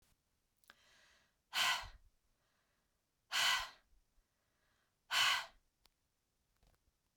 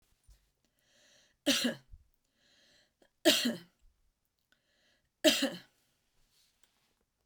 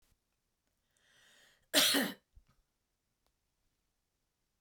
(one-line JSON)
{"exhalation_length": "7.2 s", "exhalation_amplitude": 2911, "exhalation_signal_mean_std_ratio": 0.3, "three_cough_length": "7.3 s", "three_cough_amplitude": 10384, "three_cough_signal_mean_std_ratio": 0.26, "cough_length": "4.6 s", "cough_amplitude": 7503, "cough_signal_mean_std_ratio": 0.23, "survey_phase": "beta (2021-08-13 to 2022-03-07)", "age": "45-64", "gender": "Female", "wearing_mask": "No", "symptom_cough_any": true, "symptom_headache": true, "smoker_status": "Ex-smoker", "respiratory_condition_asthma": false, "respiratory_condition_other": false, "recruitment_source": "Test and Trace", "submission_delay": "2 days", "covid_test_result": "Positive", "covid_test_method": "LAMP"}